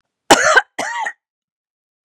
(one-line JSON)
{"cough_length": "2.0 s", "cough_amplitude": 32768, "cough_signal_mean_std_ratio": 0.37, "survey_phase": "beta (2021-08-13 to 2022-03-07)", "age": "45-64", "gender": "Female", "wearing_mask": "No", "symptom_none": true, "smoker_status": "Never smoked", "respiratory_condition_asthma": false, "respiratory_condition_other": false, "recruitment_source": "REACT", "submission_delay": "1 day", "covid_test_result": "Negative", "covid_test_method": "RT-qPCR", "influenza_a_test_result": "Negative", "influenza_b_test_result": "Negative"}